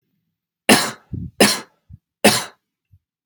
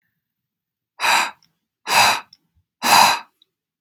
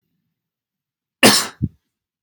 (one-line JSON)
{"three_cough_length": "3.3 s", "three_cough_amplitude": 32768, "three_cough_signal_mean_std_ratio": 0.32, "exhalation_length": "3.8 s", "exhalation_amplitude": 32768, "exhalation_signal_mean_std_ratio": 0.39, "cough_length": "2.2 s", "cough_amplitude": 32768, "cough_signal_mean_std_ratio": 0.26, "survey_phase": "beta (2021-08-13 to 2022-03-07)", "age": "18-44", "gender": "Male", "wearing_mask": "No", "symptom_cough_any": true, "symptom_runny_or_blocked_nose": true, "symptom_abdominal_pain": true, "symptom_headache": true, "smoker_status": "Never smoked", "respiratory_condition_asthma": true, "respiratory_condition_other": false, "recruitment_source": "REACT", "submission_delay": "3 days", "covid_test_result": "Negative", "covid_test_method": "RT-qPCR", "influenza_a_test_result": "Negative", "influenza_b_test_result": "Negative"}